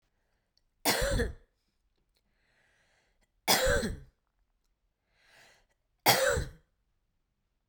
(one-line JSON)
{"three_cough_length": "7.7 s", "three_cough_amplitude": 15777, "three_cough_signal_mean_std_ratio": 0.33, "survey_phase": "beta (2021-08-13 to 2022-03-07)", "age": "45-64", "gender": "Female", "wearing_mask": "No", "symptom_none": true, "smoker_status": "Never smoked", "respiratory_condition_asthma": true, "respiratory_condition_other": false, "recruitment_source": "REACT", "submission_delay": "1 day", "covid_test_result": "Negative", "covid_test_method": "RT-qPCR"}